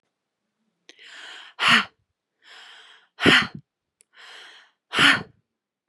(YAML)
exhalation_length: 5.9 s
exhalation_amplitude: 25183
exhalation_signal_mean_std_ratio: 0.3
survey_phase: beta (2021-08-13 to 2022-03-07)
age: 18-44
gender: Female
wearing_mask: 'No'
symptom_none: true
smoker_status: Ex-smoker
respiratory_condition_asthma: false
respiratory_condition_other: false
recruitment_source: REACT
submission_delay: 6 days
covid_test_result: Negative
covid_test_method: RT-qPCR
influenza_a_test_result: Negative
influenza_b_test_result: Negative